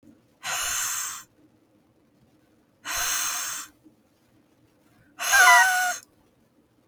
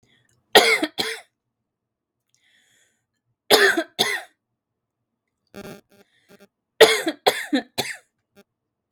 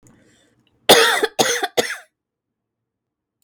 {"exhalation_length": "6.9 s", "exhalation_amplitude": 25056, "exhalation_signal_mean_std_ratio": 0.39, "three_cough_length": "8.9 s", "three_cough_amplitude": 32767, "three_cough_signal_mean_std_ratio": 0.29, "cough_length": "3.4 s", "cough_amplitude": 32768, "cough_signal_mean_std_ratio": 0.34, "survey_phase": "beta (2021-08-13 to 2022-03-07)", "age": "18-44", "gender": "Female", "wearing_mask": "No", "symptom_cough_any": true, "symptom_new_continuous_cough": true, "symptom_shortness_of_breath": true, "symptom_sore_throat": true, "symptom_diarrhoea": true, "symptom_fatigue": true, "symptom_fever_high_temperature": true, "symptom_headache": true, "symptom_onset": "4 days", "smoker_status": "Never smoked", "respiratory_condition_asthma": false, "respiratory_condition_other": false, "recruitment_source": "Test and Trace", "submission_delay": "2 days", "covid_test_result": "Positive", "covid_test_method": "RT-qPCR", "covid_ct_value": 28.4, "covid_ct_gene": "ORF1ab gene", "covid_ct_mean": 30.6, "covid_viral_load": "91 copies/ml", "covid_viral_load_category": "Minimal viral load (< 10K copies/ml)"}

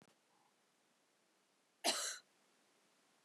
{"cough_length": "3.2 s", "cough_amplitude": 2611, "cough_signal_mean_std_ratio": 0.26, "survey_phase": "beta (2021-08-13 to 2022-03-07)", "age": "18-44", "gender": "Female", "wearing_mask": "No", "symptom_cough_any": true, "symptom_onset": "5 days", "smoker_status": "Never smoked", "respiratory_condition_asthma": true, "respiratory_condition_other": false, "recruitment_source": "Test and Trace", "submission_delay": "1 day", "covid_test_result": "Positive", "covid_test_method": "RT-qPCR", "covid_ct_value": 21.7, "covid_ct_gene": "ORF1ab gene", "covid_ct_mean": 22.0, "covid_viral_load": "61000 copies/ml", "covid_viral_load_category": "Low viral load (10K-1M copies/ml)"}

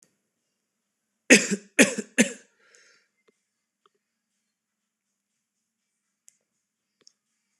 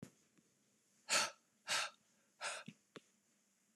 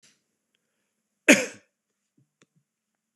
{"three_cough_length": "7.6 s", "three_cough_amplitude": 26027, "three_cough_signal_mean_std_ratio": 0.17, "exhalation_length": "3.8 s", "exhalation_amplitude": 2922, "exhalation_signal_mean_std_ratio": 0.32, "cough_length": "3.2 s", "cough_amplitude": 25922, "cough_signal_mean_std_ratio": 0.15, "survey_phase": "beta (2021-08-13 to 2022-03-07)", "age": "18-44", "gender": "Male", "wearing_mask": "No", "symptom_new_continuous_cough": true, "symptom_runny_or_blocked_nose": true, "symptom_onset": "2 days", "smoker_status": "Never smoked", "respiratory_condition_asthma": false, "respiratory_condition_other": false, "recruitment_source": "Test and Trace", "submission_delay": "2 days", "covid_test_result": "Positive", "covid_test_method": "RT-qPCR", "covid_ct_value": 31.1, "covid_ct_gene": "N gene"}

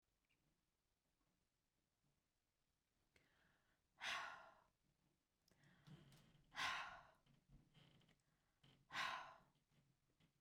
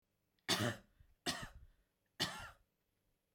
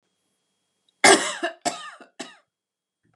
{"exhalation_length": "10.4 s", "exhalation_amplitude": 660, "exhalation_signal_mean_std_ratio": 0.32, "three_cough_length": "3.3 s", "three_cough_amplitude": 3356, "three_cough_signal_mean_std_ratio": 0.36, "cough_length": "3.2 s", "cough_amplitude": 31509, "cough_signal_mean_std_ratio": 0.26, "survey_phase": "beta (2021-08-13 to 2022-03-07)", "age": "45-64", "gender": "Female", "wearing_mask": "No", "symptom_none": true, "smoker_status": "Never smoked", "respiratory_condition_asthma": false, "respiratory_condition_other": false, "recruitment_source": "REACT", "submission_delay": "1 day", "covid_test_result": "Negative", "covid_test_method": "RT-qPCR"}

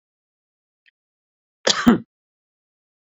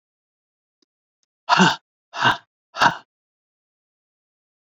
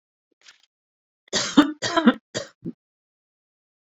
{"cough_length": "3.1 s", "cough_amplitude": 27931, "cough_signal_mean_std_ratio": 0.21, "exhalation_length": "4.8 s", "exhalation_amplitude": 26944, "exhalation_signal_mean_std_ratio": 0.26, "three_cough_length": "3.9 s", "three_cough_amplitude": 29827, "three_cough_signal_mean_std_ratio": 0.27, "survey_phase": "beta (2021-08-13 to 2022-03-07)", "age": "65+", "gender": "Female", "wearing_mask": "No", "symptom_none": true, "smoker_status": "Ex-smoker", "respiratory_condition_asthma": false, "respiratory_condition_other": false, "recruitment_source": "Test and Trace", "submission_delay": "1 day", "covid_test_result": "Negative", "covid_test_method": "RT-qPCR"}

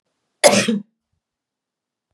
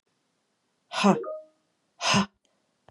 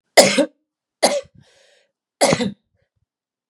{"cough_length": "2.1 s", "cough_amplitude": 32768, "cough_signal_mean_std_ratio": 0.29, "exhalation_length": "2.9 s", "exhalation_amplitude": 16932, "exhalation_signal_mean_std_ratio": 0.34, "three_cough_length": "3.5 s", "three_cough_amplitude": 32768, "three_cough_signal_mean_std_ratio": 0.33, "survey_phase": "beta (2021-08-13 to 2022-03-07)", "age": "18-44", "gender": "Female", "wearing_mask": "No", "symptom_runny_or_blocked_nose": true, "symptom_sore_throat": true, "symptom_onset": "3 days", "smoker_status": "Never smoked", "respiratory_condition_asthma": false, "respiratory_condition_other": false, "recruitment_source": "Test and Trace", "submission_delay": "2 days", "covid_test_result": "Positive", "covid_test_method": "RT-qPCR", "covid_ct_value": 19.5, "covid_ct_gene": "N gene"}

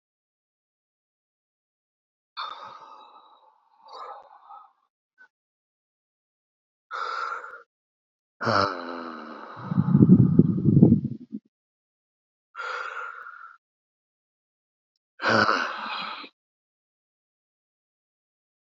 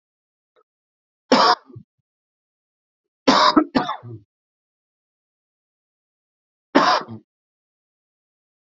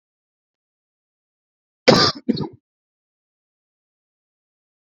{"exhalation_length": "18.6 s", "exhalation_amplitude": 26857, "exhalation_signal_mean_std_ratio": 0.3, "three_cough_length": "8.8 s", "three_cough_amplitude": 29989, "three_cough_signal_mean_std_ratio": 0.27, "cough_length": "4.9 s", "cough_amplitude": 30462, "cough_signal_mean_std_ratio": 0.2, "survey_phase": "beta (2021-08-13 to 2022-03-07)", "age": "18-44", "gender": "Male", "wearing_mask": "No", "symptom_cough_any": true, "symptom_fatigue": true, "symptom_fever_high_temperature": true, "symptom_headache": true, "smoker_status": "Never smoked", "respiratory_condition_asthma": false, "respiratory_condition_other": false, "recruitment_source": "Test and Trace", "submission_delay": "49 days", "covid_test_result": "Negative", "covid_test_method": "RT-qPCR"}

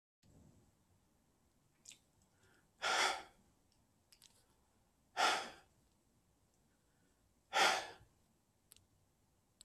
{"exhalation_length": "9.6 s", "exhalation_amplitude": 3491, "exhalation_signal_mean_std_ratio": 0.27, "survey_phase": "beta (2021-08-13 to 2022-03-07)", "age": "45-64", "gender": "Male", "wearing_mask": "No", "symptom_none": true, "smoker_status": "Current smoker (1 to 10 cigarettes per day)", "respiratory_condition_asthma": false, "respiratory_condition_other": false, "recruitment_source": "REACT", "submission_delay": "2 days", "covid_test_result": "Negative", "covid_test_method": "RT-qPCR", "influenza_a_test_result": "Negative", "influenza_b_test_result": "Negative"}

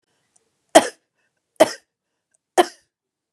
{"three_cough_length": "3.3 s", "three_cough_amplitude": 32768, "three_cough_signal_mean_std_ratio": 0.19, "survey_phase": "beta (2021-08-13 to 2022-03-07)", "age": "45-64", "gender": "Female", "wearing_mask": "No", "symptom_none": true, "smoker_status": "Ex-smoker", "respiratory_condition_asthma": false, "respiratory_condition_other": false, "recruitment_source": "REACT", "submission_delay": "2 days", "covid_test_result": "Negative", "covid_test_method": "RT-qPCR", "influenza_a_test_result": "Negative", "influenza_b_test_result": "Negative"}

